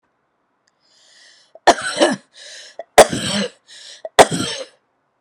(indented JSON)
{
  "three_cough_length": "5.2 s",
  "three_cough_amplitude": 32768,
  "three_cough_signal_mean_std_ratio": 0.3,
  "survey_phase": "alpha (2021-03-01 to 2021-08-12)",
  "age": "45-64",
  "gender": "Female",
  "wearing_mask": "No",
  "symptom_cough_any": true,
  "symptom_fatigue": true,
  "symptom_headache": true,
  "symptom_onset": "9 days",
  "smoker_status": "Never smoked",
  "respiratory_condition_asthma": false,
  "respiratory_condition_other": false,
  "recruitment_source": "REACT",
  "submission_delay": "2 days",
  "covid_test_result": "Negative",
  "covid_test_method": "RT-qPCR"
}